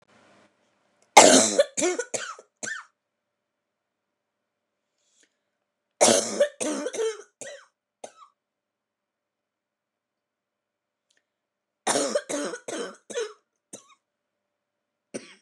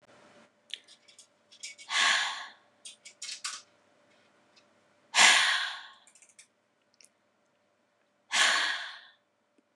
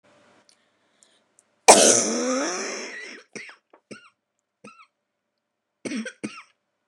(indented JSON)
{
  "three_cough_length": "15.4 s",
  "three_cough_amplitude": 29204,
  "three_cough_signal_mean_std_ratio": 0.27,
  "exhalation_length": "9.8 s",
  "exhalation_amplitude": 18536,
  "exhalation_signal_mean_std_ratio": 0.33,
  "cough_length": "6.9 s",
  "cough_amplitude": 29204,
  "cough_signal_mean_std_ratio": 0.29,
  "survey_phase": "beta (2021-08-13 to 2022-03-07)",
  "age": "18-44",
  "gender": "Female",
  "wearing_mask": "No",
  "symptom_cough_any": true,
  "symptom_fever_high_temperature": true,
  "symptom_onset": "3 days",
  "smoker_status": "Never smoked",
  "respiratory_condition_asthma": true,
  "respiratory_condition_other": false,
  "recruitment_source": "Test and Trace",
  "submission_delay": "2 days",
  "covid_test_result": "Negative",
  "covid_test_method": "RT-qPCR"
}